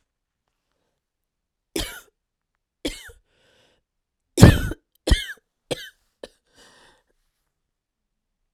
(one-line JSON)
{"three_cough_length": "8.5 s", "three_cough_amplitude": 32768, "three_cough_signal_mean_std_ratio": 0.17, "survey_phase": "beta (2021-08-13 to 2022-03-07)", "age": "45-64", "gender": "Female", "wearing_mask": "No", "symptom_cough_any": true, "symptom_runny_or_blocked_nose": true, "symptom_shortness_of_breath": true, "symptom_sore_throat": true, "symptom_fatigue": true, "symptom_fever_high_temperature": true, "symptom_headache": true, "symptom_onset": "3 days", "smoker_status": "Never smoked", "respiratory_condition_asthma": false, "respiratory_condition_other": false, "recruitment_source": "Test and Trace", "submission_delay": "2 days", "covid_test_result": "Positive", "covid_test_method": "RT-qPCR", "covid_ct_value": 22.7, "covid_ct_gene": "ORF1ab gene"}